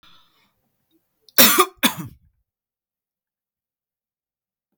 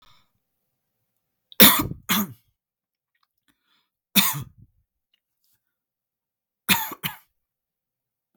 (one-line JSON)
{"cough_length": "4.8 s", "cough_amplitude": 32768, "cough_signal_mean_std_ratio": 0.21, "three_cough_length": "8.4 s", "three_cough_amplitude": 32768, "three_cough_signal_mean_std_ratio": 0.22, "survey_phase": "beta (2021-08-13 to 2022-03-07)", "age": "18-44", "gender": "Male", "wearing_mask": "No", "symptom_none": true, "smoker_status": "Never smoked", "respiratory_condition_asthma": true, "respiratory_condition_other": false, "recruitment_source": "REACT", "submission_delay": "2 days", "covid_test_result": "Negative", "covid_test_method": "RT-qPCR", "influenza_a_test_result": "Negative", "influenza_b_test_result": "Negative"}